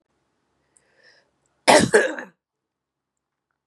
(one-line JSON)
{"cough_length": "3.7 s", "cough_amplitude": 30855, "cough_signal_mean_std_ratio": 0.25, "survey_phase": "beta (2021-08-13 to 2022-03-07)", "age": "45-64", "gender": "Female", "wearing_mask": "No", "symptom_cough_any": true, "symptom_runny_or_blocked_nose": true, "symptom_fatigue": true, "symptom_change_to_sense_of_smell_or_taste": true, "symptom_loss_of_taste": true, "symptom_onset": "3 days", "smoker_status": "Never smoked", "respiratory_condition_asthma": false, "respiratory_condition_other": false, "recruitment_source": "REACT", "submission_delay": "2 days", "covid_test_result": "Positive", "covid_test_method": "RT-qPCR", "covid_ct_value": 19.0, "covid_ct_gene": "E gene", "influenza_a_test_result": "Negative", "influenza_b_test_result": "Negative"}